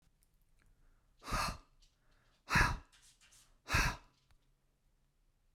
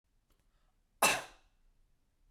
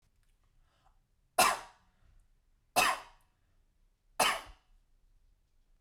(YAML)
exhalation_length: 5.5 s
exhalation_amplitude: 4715
exhalation_signal_mean_std_ratio: 0.31
cough_length: 2.3 s
cough_amplitude: 6130
cough_signal_mean_std_ratio: 0.23
three_cough_length: 5.8 s
three_cough_amplitude: 8212
three_cough_signal_mean_std_ratio: 0.27
survey_phase: beta (2021-08-13 to 2022-03-07)
age: 45-64
gender: Male
wearing_mask: 'No'
symptom_none: true
smoker_status: Never smoked
respiratory_condition_asthma: false
respiratory_condition_other: false
recruitment_source: REACT
submission_delay: 1 day
covid_test_result: Negative
covid_test_method: RT-qPCR
influenza_a_test_result: Negative
influenza_b_test_result: Negative